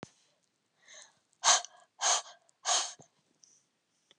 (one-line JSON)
{"exhalation_length": "4.2 s", "exhalation_amplitude": 10628, "exhalation_signal_mean_std_ratio": 0.3, "survey_phase": "beta (2021-08-13 to 2022-03-07)", "age": "45-64", "gender": "Female", "wearing_mask": "No", "symptom_cough_any": true, "symptom_fatigue": true, "smoker_status": "Never smoked", "respiratory_condition_asthma": true, "respiratory_condition_other": false, "recruitment_source": "REACT", "submission_delay": "1 day", "covid_test_result": "Negative", "covid_test_method": "RT-qPCR"}